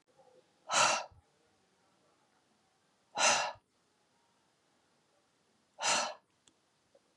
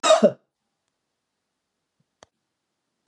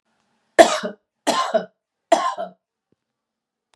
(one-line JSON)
{"exhalation_length": "7.2 s", "exhalation_amplitude": 6540, "exhalation_signal_mean_std_ratio": 0.3, "cough_length": "3.1 s", "cough_amplitude": 21340, "cough_signal_mean_std_ratio": 0.22, "three_cough_length": "3.8 s", "three_cough_amplitude": 32768, "three_cough_signal_mean_std_ratio": 0.3, "survey_phase": "beta (2021-08-13 to 2022-03-07)", "age": "65+", "gender": "Female", "wearing_mask": "No", "symptom_none": true, "smoker_status": "Ex-smoker", "respiratory_condition_asthma": false, "respiratory_condition_other": false, "recruitment_source": "REACT", "submission_delay": "2 days", "covid_test_result": "Negative", "covid_test_method": "RT-qPCR", "influenza_a_test_result": "Negative", "influenza_b_test_result": "Negative"}